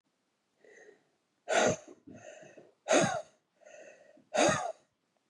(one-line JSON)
{"exhalation_length": "5.3 s", "exhalation_amplitude": 7325, "exhalation_signal_mean_std_ratio": 0.36, "survey_phase": "beta (2021-08-13 to 2022-03-07)", "age": "45-64", "gender": "Female", "wearing_mask": "No", "symptom_none": true, "smoker_status": "Never smoked", "respiratory_condition_asthma": false, "respiratory_condition_other": false, "recruitment_source": "REACT", "submission_delay": "0 days", "covid_test_result": "Negative", "covid_test_method": "RT-qPCR", "influenza_a_test_result": "Negative", "influenza_b_test_result": "Negative"}